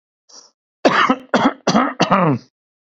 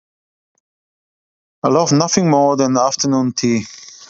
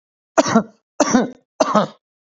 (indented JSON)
{
  "cough_length": "2.8 s",
  "cough_amplitude": 29005,
  "cough_signal_mean_std_ratio": 0.53,
  "exhalation_length": "4.1 s",
  "exhalation_amplitude": 30939,
  "exhalation_signal_mean_std_ratio": 0.6,
  "three_cough_length": "2.2 s",
  "three_cough_amplitude": 28071,
  "three_cough_signal_mean_std_ratio": 0.44,
  "survey_phase": "beta (2021-08-13 to 2022-03-07)",
  "age": "45-64",
  "gender": "Male",
  "wearing_mask": "No",
  "symptom_runny_or_blocked_nose": true,
  "smoker_status": "Ex-smoker",
  "respiratory_condition_asthma": false,
  "respiratory_condition_other": false,
  "recruitment_source": "REACT",
  "submission_delay": "2 days",
  "covid_test_result": "Negative",
  "covid_test_method": "RT-qPCR",
  "influenza_a_test_result": "Negative",
  "influenza_b_test_result": "Negative"
}